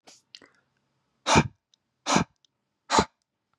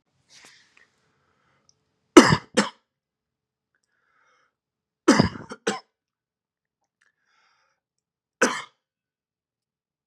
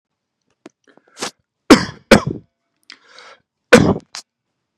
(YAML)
exhalation_length: 3.6 s
exhalation_amplitude: 20210
exhalation_signal_mean_std_ratio: 0.28
three_cough_length: 10.1 s
three_cough_amplitude: 32768
three_cough_signal_mean_std_ratio: 0.17
cough_length: 4.8 s
cough_amplitude: 32768
cough_signal_mean_std_ratio: 0.25
survey_phase: beta (2021-08-13 to 2022-03-07)
age: 18-44
gender: Male
wearing_mask: 'No'
symptom_runny_or_blocked_nose: true
symptom_sore_throat: true
smoker_status: Never smoked
respiratory_condition_asthma: false
respiratory_condition_other: false
recruitment_source: REACT
submission_delay: 2 days
covid_test_result: Positive
covid_test_method: RT-qPCR
covid_ct_value: 34.0
covid_ct_gene: E gene
influenza_a_test_result: Negative
influenza_b_test_result: Negative